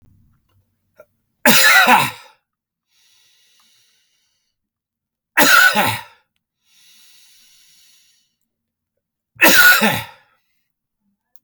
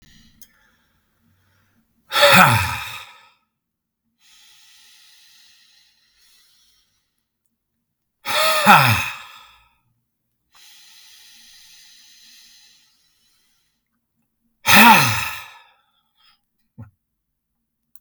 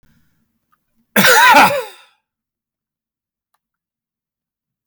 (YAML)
three_cough_length: 11.4 s
three_cough_amplitude: 32768
three_cough_signal_mean_std_ratio: 0.33
exhalation_length: 18.0 s
exhalation_amplitude: 32768
exhalation_signal_mean_std_ratio: 0.27
cough_length: 4.9 s
cough_amplitude: 32768
cough_signal_mean_std_ratio: 0.31
survey_phase: beta (2021-08-13 to 2022-03-07)
age: 45-64
gender: Male
wearing_mask: 'No'
symptom_other: true
smoker_status: Never smoked
respiratory_condition_asthma: false
respiratory_condition_other: false
recruitment_source: REACT
submission_delay: 3 days
covid_test_result: Negative
covid_test_method: RT-qPCR
influenza_a_test_result: Unknown/Void
influenza_b_test_result: Unknown/Void